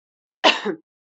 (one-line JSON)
{"cough_length": "1.2 s", "cough_amplitude": 30650, "cough_signal_mean_std_ratio": 0.31, "survey_phase": "beta (2021-08-13 to 2022-03-07)", "age": "45-64", "gender": "Female", "wearing_mask": "No", "symptom_cough_any": true, "symptom_sore_throat": true, "symptom_onset": "12 days", "smoker_status": "Never smoked", "respiratory_condition_asthma": false, "respiratory_condition_other": false, "recruitment_source": "REACT", "submission_delay": "3 days", "covid_test_result": "Negative", "covid_test_method": "RT-qPCR", "covid_ct_value": 38.0, "covid_ct_gene": "N gene", "influenza_a_test_result": "Negative", "influenza_b_test_result": "Negative"}